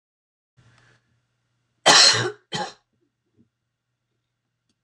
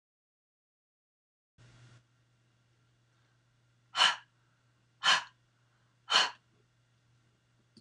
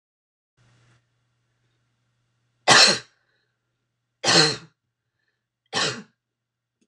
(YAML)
cough_length: 4.8 s
cough_amplitude: 26028
cough_signal_mean_std_ratio: 0.25
exhalation_length: 7.8 s
exhalation_amplitude: 8968
exhalation_signal_mean_std_ratio: 0.22
three_cough_length: 6.9 s
three_cough_amplitude: 26028
three_cough_signal_mean_std_ratio: 0.25
survey_phase: alpha (2021-03-01 to 2021-08-12)
age: 65+
gender: Female
wearing_mask: 'No'
symptom_none: true
smoker_status: Ex-smoker
respiratory_condition_asthma: false
respiratory_condition_other: false
recruitment_source: REACT
submission_delay: 1 day
covid_test_result: Negative
covid_test_method: RT-qPCR